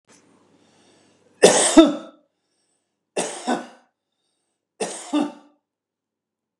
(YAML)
three_cough_length: 6.6 s
three_cough_amplitude: 32768
three_cough_signal_mean_std_ratio: 0.27
survey_phase: beta (2021-08-13 to 2022-03-07)
age: 65+
gender: Male
wearing_mask: 'No'
symptom_none: true
smoker_status: Never smoked
respiratory_condition_asthma: false
respiratory_condition_other: false
recruitment_source: REACT
submission_delay: 1 day
covid_test_result: Negative
covid_test_method: RT-qPCR
influenza_a_test_result: Negative
influenza_b_test_result: Negative